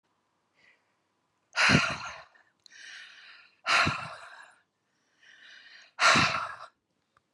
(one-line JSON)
{"exhalation_length": "7.3 s", "exhalation_amplitude": 14242, "exhalation_signal_mean_std_ratio": 0.35, "survey_phase": "beta (2021-08-13 to 2022-03-07)", "age": "45-64", "gender": "Female", "wearing_mask": "No", "symptom_none": true, "smoker_status": "Never smoked", "respiratory_condition_asthma": false, "respiratory_condition_other": false, "recruitment_source": "REACT", "submission_delay": "1 day", "covid_test_result": "Negative", "covid_test_method": "RT-qPCR"}